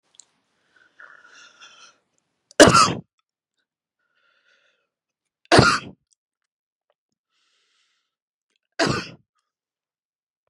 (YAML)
three_cough_length: 10.5 s
three_cough_amplitude: 32768
three_cough_signal_mean_std_ratio: 0.2
survey_phase: beta (2021-08-13 to 2022-03-07)
age: 45-64
gender: Female
wearing_mask: 'No'
symptom_cough_any: true
symptom_runny_or_blocked_nose: true
symptom_shortness_of_breath: true
symptom_sore_throat: true
symptom_fatigue: true
symptom_fever_high_temperature: true
symptom_headache: true
symptom_loss_of_taste: true
symptom_onset: 5 days
smoker_status: Never smoked
respiratory_condition_asthma: false
respiratory_condition_other: false
recruitment_source: Test and Trace
submission_delay: 2 days
covid_test_result: Positive
covid_test_method: RT-qPCR
covid_ct_value: 16.5
covid_ct_gene: ORF1ab gene
covid_ct_mean: 16.7
covid_viral_load: 3200000 copies/ml
covid_viral_load_category: High viral load (>1M copies/ml)